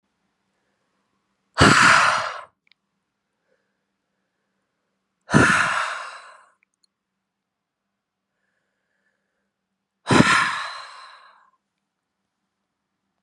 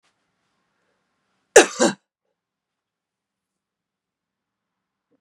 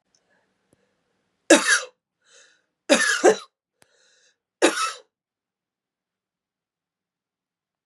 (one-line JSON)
{"exhalation_length": "13.2 s", "exhalation_amplitude": 30552, "exhalation_signal_mean_std_ratio": 0.29, "cough_length": "5.2 s", "cough_amplitude": 32768, "cough_signal_mean_std_ratio": 0.14, "three_cough_length": "7.9 s", "three_cough_amplitude": 30397, "three_cough_signal_mean_std_ratio": 0.25, "survey_phase": "beta (2021-08-13 to 2022-03-07)", "age": "45-64", "gender": "Female", "wearing_mask": "No", "symptom_runny_or_blocked_nose": true, "smoker_status": "Never smoked", "respiratory_condition_asthma": true, "respiratory_condition_other": false, "recruitment_source": "Test and Trace", "submission_delay": "1 day", "covid_test_result": "Positive", "covid_test_method": "RT-qPCR", "covid_ct_value": 20.9, "covid_ct_gene": "ORF1ab gene", "covid_ct_mean": 21.5, "covid_viral_load": "88000 copies/ml", "covid_viral_load_category": "Low viral load (10K-1M copies/ml)"}